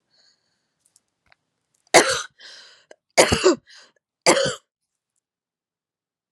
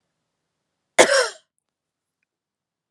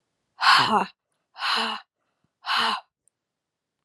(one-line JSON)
{"three_cough_length": "6.3 s", "three_cough_amplitude": 32767, "three_cough_signal_mean_std_ratio": 0.27, "cough_length": "2.9 s", "cough_amplitude": 32767, "cough_signal_mean_std_ratio": 0.22, "exhalation_length": "3.8 s", "exhalation_amplitude": 19109, "exhalation_signal_mean_std_ratio": 0.42, "survey_phase": "beta (2021-08-13 to 2022-03-07)", "age": "18-44", "gender": "Female", "wearing_mask": "No", "symptom_none": true, "smoker_status": "Never smoked", "respiratory_condition_asthma": false, "respiratory_condition_other": false, "recruitment_source": "REACT", "submission_delay": "1 day", "covid_test_result": "Negative", "covid_test_method": "RT-qPCR", "influenza_a_test_result": "Unknown/Void", "influenza_b_test_result": "Unknown/Void"}